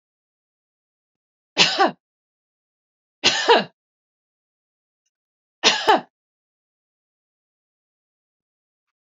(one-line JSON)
{"three_cough_length": "9.0 s", "three_cough_amplitude": 30288, "three_cough_signal_mean_std_ratio": 0.24, "survey_phase": "beta (2021-08-13 to 2022-03-07)", "age": "45-64", "gender": "Female", "wearing_mask": "No", "symptom_none": true, "smoker_status": "Never smoked", "respiratory_condition_asthma": false, "respiratory_condition_other": false, "recruitment_source": "REACT", "submission_delay": "2 days", "covid_test_result": "Negative", "covid_test_method": "RT-qPCR", "influenza_a_test_result": "Negative", "influenza_b_test_result": "Negative"}